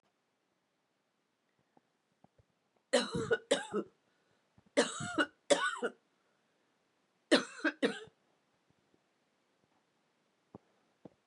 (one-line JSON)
{"three_cough_length": "11.3 s", "three_cough_amplitude": 7442, "three_cough_signal_mean_std_ratio": 0.28, "survey_phase": "beta (2021-08-13 to 2022-03-07)", "age": "45-64", "gender": "Female", "wearing_mask": "No", "symptom_cough_any": true, "symptom_runny_or_blocked_nose": true, "symptom_sore_throat": true, "symptom_diarrhoea": true, "symptom_headache": true, "symptom_other": true, "symptom_onset": "5 days", "smoker_status": "Ex-smoker", "respiratory_condition_asthma": false, "respiratory_condition_other": false, "recruitment_source": "Test and Trace", "submission_delay": "2 days", "covid_test_result": "Positive", "covid_test_method": "RT-qPCR", "covid_ct_value": 22.3, "covid_ct_gene": "N gene"}